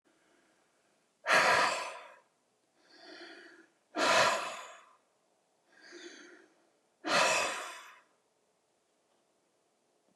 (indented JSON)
{
  "exhalation_length": "10.2 s",
  "exhalation_amplitude": 7406,
  "exhalation_signal_mean_std_ratio": 0.36,
  "survey_phase": "beta (2021-08-13 to 2022-03-07)",
  "age": "45-64",
  "gender": "Male",
  "wearing_mask": "No",
  "symptom_none": true,
  "smoker_status": "Never smoked",
  "respiratory_condition_asthma": false,
  "respiratory_condition_other": false,
  "recruitment_source": "REACT",
  "submission_delay": "2 days",
  "covid_test_result": "Negative",
  "covid_test_method": "RT-qPCR"
}